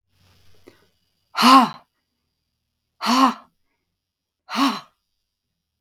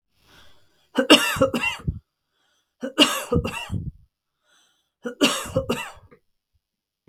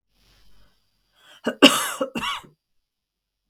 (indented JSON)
{
  "exhalation_length": "5.8 s",
  "exhalation_amplitude": 32766,
  "exhalation_signal_mean_std_ratio": 0.29,
  "three_cough_length": "7.1 s",
  "three_cough_amplitude": 32768,
  "three_cough_signal_mean_std_ratio": 0.37,
  "cough_length": "3.5 s",
  "cough_amplitude": 32768,
  "cough_signal_mean_std_ratio": 0.26,
  "survey_phase": "beta (2021-08-13 to 2022-03-07)",
  "age": "65+",
  "gender": "Female",
  "wearing_mask": "Yes",
  "symptom_none": true,
  "smoker_status": "Never smoked",
  "respiratory_condition_asthma": false,
  "respiratory_condition_other": false,
  "recruitment_source": "REACT",
  "submission_delay": "3 days",
  "covid_test_result": "Negative",
  "covid_test_method": "RT-qPCR",
  "influenza_a_test_result": "Unknown/Void",
  "influenza_b_test_result": "Unknown/Void"
}